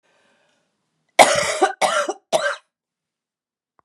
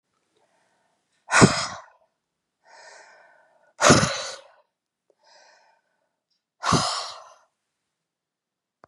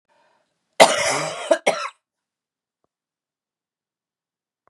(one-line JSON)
{"three_cough_length": "3.8 s", "three_cough_amplitude": 32768, "three_cough_signal_mean_std_ratio": 0.35, "exhalation_length": "8.9 s", "exhalation_amplitude": 30828, "exhalation_signal_mean_std_ratio": 0.26, "cough_length": "4.7 s", "cough_amplitude": 32768, "cough_signal_mean_std_ratio": 0.26, "survey_phase": "beta (2021-08-13 to 2022-03-07)", "age": "65+", "gender": "Female", "wearing_mask": "No", "symptom_cough_any": true, "symptom_new_continuous_cough": true, "symptom_runny_or_blocked_nose": true, "symptom_fatigue": true, "symptom_change_to_sense_of_smell_or_taste": true, "symptom_onset": "3 days", "smoker_status": "Ex-smoker", "respiratory_condition_asthma": false, "respiratory_condition_other": false, "recruitment_source": "Test and Trace", "submission_delay": "1 day", "covid_test_result": "Positive", "covid_test_method": "RT-qPCR", "covid_ct_value": 15.6, "covid_ct_gene": "ORF1ab gene"}